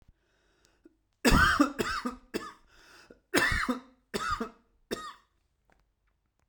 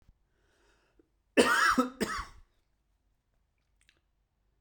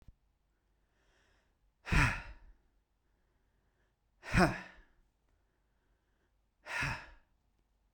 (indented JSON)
{
  "three_cough_length": "6.5 s",
  "three_cough_amplitude": 13311,
  "three_cough_signal_mean_std_ratio": 0.38,
  "cough_length": "4.6 s",
  "cough_amplitude": 14281,
  "cough_signal_mean_std_ratio": 0.3,
  "exhalation_length": "7.9 s",
  "exhalation_amplitude": 7012,
  "exhalation_signal_mean_std_ratio": 0.26,
  "survey_phase": "beta (2021-08-13 to 2022-03-07)",
  "age": "18-44",
  "gender": "Male",
  "wearing_mask": "No",
  "symptom_cough_any": true,
  "symptom_new_continuous_cough": true,
  "symptom_runny_or_blocked_nose": true,
  "symptom_sore_throat": true,
  "symptom_headache": true,
  "smoker_status": "Current smoker (1 to 10 cigarettes per day)",
  "respiratory_condition_asthma": false,
  "respiratory_condition_other": false,
  "recruitment_source": "Test and Trace",
  "submission_delay": "2 days",
  "covid_test_result": "Positive",
  "covid_test_method": "RT-qPCR",
  "covid_ct_value": 32.9,
  "covid_ct_gene": "N gene"
}